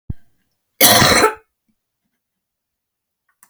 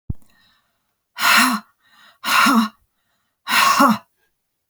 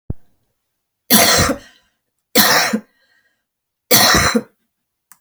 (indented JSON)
{
  "cough_length": "3.5 s",
  "cough_amplitude": 32768,
  "cough_signal_mean_std_ratio": 0.32,
  "exhalation_length": "4.7 s",
  "exhalation_amplitude": 28995,
  "exhalation_signal_mean_std_ratio": 0.45,
  "three_cough_length": "5.2 s",
  "three_cough_amplitude": 32768,
  "three_cough_signal_mean_std_ratio": 0.43,
  "survey_phase": "beta (2021-08-13 to 2022-03-07)",
  "age": "65+",
  "gender": "Female",
  "wearing_mask": "No",
  "symptom_cough_any": true,
  "smoker_status": "Never smoked",
  "respiratory_condition_asthma": true,
  "respiratory_condition_other": false,
  "recruitment_source": "REACT",
  "submission_delay": "1 day",
  "covid_test_result": "Negative",
  "covid_test_method": "RT-qPCR"
}